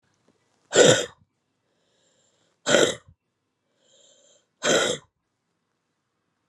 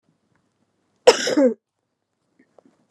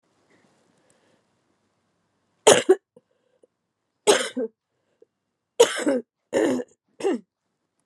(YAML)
exhalation_length: 6.5 s
exhalation_amplitude: 26861
exhalation_signal_mean_std_ratio: 0.28
cough_length: 2.9 s
cough_amplitude: 32768
cough_signal_mean_std_ratio: 0.26
three_cough_length: 7.9 s
three_cough_amplitude: 32056
three_cough_signal_mean_std_ratio: 0.28
survey_phase: beta (2021-08-13 to 2022-03-07)
age: 45-64
gender: Female
wearing_mask: 'No'
symptom_new_continuous_cough: true
symptom_runny_or_blocked_nose: true
symptom_sore_throat: true
symptom_abdominal_pain: true
symptom_diarrhoea: true
symptom_fatigue: true
smoker_status: Never smoked
respiratory_condition_asthma: true
respiratory_condition_other: false
recruitment_source: Test and Trace
submission_delay: 1 day
covid_test_result: Positive
covid_test_method: LFT